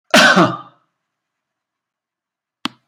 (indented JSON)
{
  "cough_length": "2.9 s",
  "cough_amplitude": 32768,
  "cough_signal_mean_std_ratio": 0.3,
  "survey_phase": "beta (2021-08-13 to 2022-03-07)",
  "age": "65+",
  "gender": "Male",
  "wearing_mask": "No",
  "symptom_none": true,
  "smoker_status": "Never smoked",
  "respiratory_condition_asthma": false,
  "respiratory_condition_other": false,
  "recruitment_source": "REACT",
  "submission_delay": "2 days",
  "covid_test_result": "Negative",
  "covid_test_method": "RT-qPCR",
  "influenza_a_test_result": "Negative",
  "influenza_b_test_result": "Negative"
}